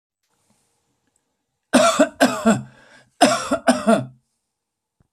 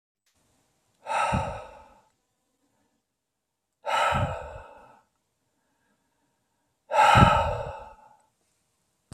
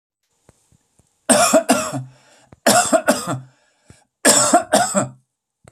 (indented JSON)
{
  "cough_length": "5.1 s",
  "cough_amplitude": 29840,
  "cough_signal_mean_std_ratio": 0.39,
  "exhalation_length": "9.1 s",
  "exhalation_amplitude": 22994,
  "exhalation_signal_mean_std_ratio": 0.33,
  "three_cough_length": "5.7 s",
  "three_cough_amplitude": 32768,
  "three_cough_signal_mean_std_ratio": 0.46,
  "survey_phase": "alpha (2021-03-01 to 2021-08-12)",
  "age": "45-64",
  "gender": "Male",
  "wearing_mask": "No",
  "symptom_cough_any": true,
  "smoker_status": "Ex-smoker",
  "respiratory_condition_asthma": false,
  "respiratory_condition_other": false,
  "recruitment_source": "REACT",
  "submission_delay": "1 day",
  "covid_test_result": "Negative",
  "covid_test_method": "RT-qPCR"
}